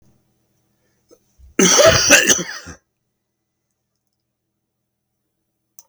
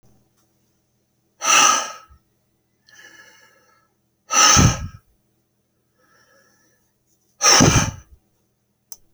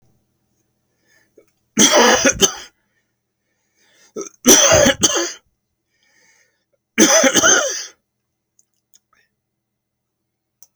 {"cough_length": "5.9 s", "cough_amplitude": 32768, "cough_signal_mean_std_ratio": 0.3, "exhalation_length": "9.1 s", "exhalation_amplitude": 32535, "exhalation_signal_mean_std_ratio": 0.32, "three_cough_length": "10.8 s", "three_cough_amplitude": 32768, "three_cough_signal_mean_std_ratio": 0.36, "survey_phase": "beta (2021-08-13 to 2022-03-07)", "age": "65+", "gender": "Male", "wearing_mask": "No", "symptom_none": true, "smoker_status": "Never smoked", "respiratory_condition_asthma": false, "respiratory_condition_other": false, "recruitment_source": "REACT", "submission_delay": "1 day", "covid_test_result": "Negative", "covid_test_method": "RT-qPCR"}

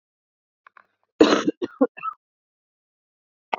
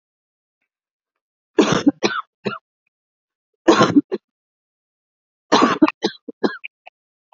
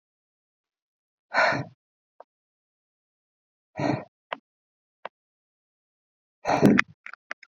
{"cough_length": "3.6 s", "cough_amplitude": 27554, "cough_signal_mean_std_ratio": 0.25, "three_cough_length": "7.3 s", "three_cough_amplitude": 32768, "three_cough_signal_mean_std_ratio": 0.31, "exhalation_length": "7.5 s", "exhalation_amplitude": 27963, "exhalation_signal_mean_std_ratio": 0.25, "survey_phase": "beta (2021-08-13 to 2022-03-07)", "age": "45-64", "gender": "Female", "wearing_mask": "No", "symptom_cough_any": true, "symptom_runny_or_blocked_nose": true, "symptom_headache": true, "symptom_onset": "8 days", "smoker_status": "Ex-smoker", "respiratory_condition_asthma": false, "respiratory_condition_other": false, "recruitment_source": "REACT", "submission_delay": "1 day", "covid_test_result": "Negative", "covid_test_method": "RT-qPCR"}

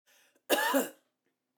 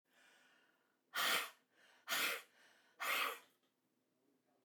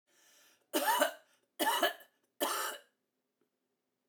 {"cough_length": "1.6 s", "cough_amplitude": 7493, "cough_signal_mean_std_ratio": 0.4, "exhalation_length": "4.6 s", "exhalation_amplitude": 2295, "exhalation_signal_mean_std_ratio": 0.4, "three_cough_length": "4.1 s", "three_cough_amplitude": 6771, "three_cough_signal_mean_std_ratio": 0.41, "survey_phase": "beta (2021-08-13 to 2022-03-07)", "age": "65+", "gender": "Female", "wearing_mask": "No", "symptom_cough_any": true, "symptom_runny_or_blocked_nose": true, "symptom_sore_throat": true, "symptom_onset": "8 days", "smoker_status": "Never smoked", "respiratory_condition_asthma": false, "respiratory_condition_other": false, "recruitment_source": "REACT", "submission_delay": "1 day", "covid_test_result": "Negative", "covid_test_method": "RT-qPCR"}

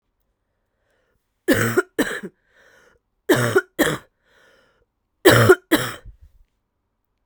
{"three_cough_length": "7.3 s", "three_cough_amplitude": 32768, "three_cough_signal_mean_std_ratio": 0.33, "survey_phase": "beta (2021-08-13 to 2022-03-07)", "age": "18-44", "gender": "Female", "wearing_mask": "No", "symptom_cough_any": true, "symptom_new_continuous_cough": true, "symptom_runny_or_blocked_nose": true, "symptom_headache": true, "symptom_other": true, "smoker_status": "Ex-smoker", "respiratory_condition_asthma": true, "respiratory_condition_other": false, "recruitment_source": "Test and Trace", "submission_delay": "2 days", "covid_test_result": "Positive", "covid_test_method": "ePCR"}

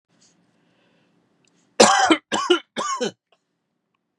{"three_cough_length": "4.2 s", "three_cough_amplitude": 32767, "three_cough_signal_mean_std_ratio": 0.33, "survey_phase": "beta (2021-08-13 to 2022-03-07)", "age": "45-64", "gender": "Male", "wearing_mask": "No", "symptom_runny_or_blocked_nose": true, "smoker_status": "Never smoked", "respiratory_condition_asthma": false, "respiratory_condition_other": false, "recruitment_source": "REACT", "submission_delay": "0 days", "covid_test_result": "Negative", "covid_test_method": "RT-qPCR", "influenza_a_test_result": "Unknown/Void", "influenza_b_test_result": "Unknown/Void"}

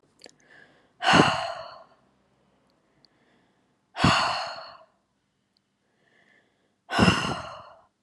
{"exhalation_length": "8.0 s", "exhalation_amplitude": 25494, "exhalation_signal_mean_std_ratio": 0.33, "survey_phase": "alpha (2021-03-01 to 2021-08-12)", "age": "18-44", "gender": "Female", "wearing_mask": "No", "symptom_fatigue": true, "symptom_headache": true, "smoker_status": "Never smoked", "respiratory_condition_asthma": false, "respiratory_condition_other": false, "recruitment_source": "Test and Trace", "submission_delay": "1 day", "covid_test_result": "Positive", "covid_test_method": "RT-qPCR", "covid_ct_value": 30.0, "covid_ct_gene": "ORF1ab gene"}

